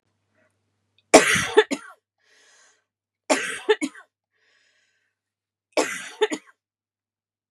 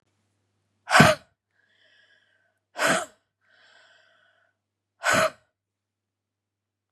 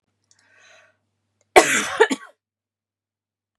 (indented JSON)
{
  "three_cough_length": "7.5 s",
  "three_cough_amplitude": 32768,
  "three_cough_signal_mean_std_ratio": 0.26,
  "exhalation_length": "6.9 s",
  "exhalation_amplitude": 32189,
  "exhalation_signal_mean_std_ratio": 0.24,
  "cough_length": "3.6 s",
  "cough_amplitude": 32768,
  "cough_signal_mean_std_ratio": 0.24,
  "survey_phase": "beta (2021-08-13 to 2022-03-07)",
  "age": "45-64",
  "gender": "Female",
  "wearing_mask": "No",
  "symptom_cough_any": true,
  "symptom_sore_throat": true,
  "symptom_onset": "3 days",
  "smoker_status": "Ex-smoker",
  "respiratory_condition_asthma": false,
  "respiratory_condition_other": false,
  "recruitment_source": "REACT",
  "submission_delay": "0 days",
  "covid_test_result": "Negative",
  "covid_test_method": "RT-qPCR"
}